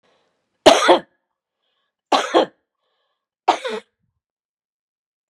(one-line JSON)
{"three_cough_length": "5.3 s", "three_cough_amplitude": 32768, "three_cough_signal_mean_std_ratio": 0.27, "survey_phase": "beta (2021-08-13 to 2022-03-07)", "age": "45-64", "gender": "Female", "wearing_mask": "No", "symptom_none": true, "smoker_status": "Ex-smoker", "respiratory_condition_asthma": false, "respiratory_condition_other": false, "recruitment_source": "REACT", "submission_delay": "2 days", "covid_test_result": "Negative", "covid_test_method": "RT-qPCR", "influenza_a_test_result": "Unknown/Void", "influenza_b_test_result": "Unknown/Void"}